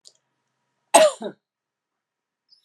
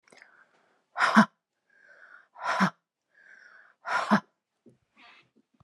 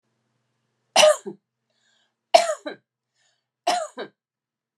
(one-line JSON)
{"cough_length": "2.6 s", "cough_amplitude": 31963, "cough_signal_mean_std_ratio": 0.22, "exhalation_length": "5.6 s", "exhalation_amplitude": 21657, "exhalation_signal_mean_std_ratio": 0.29, "three_cough_length": "4.8 s", "three_cough_amplitude": 31157, "three_cough_signal_mean_std_ratio": 0.26, "survey_phase": "beta (2021-08-13 to 2022-03-07)", "age": "45-64", "gender": "Female", "wearing_mask": "No", "symptom_none": true, "smoker_status": "Ex-smoker", "respiratory_condition_asthma": false, "respiratory_condition_other": false, "recruitment_source": "REACT", "submission_delay": "3 days", "covid_test_result": "Negative", "covid_test_method": "RT-qPCR"}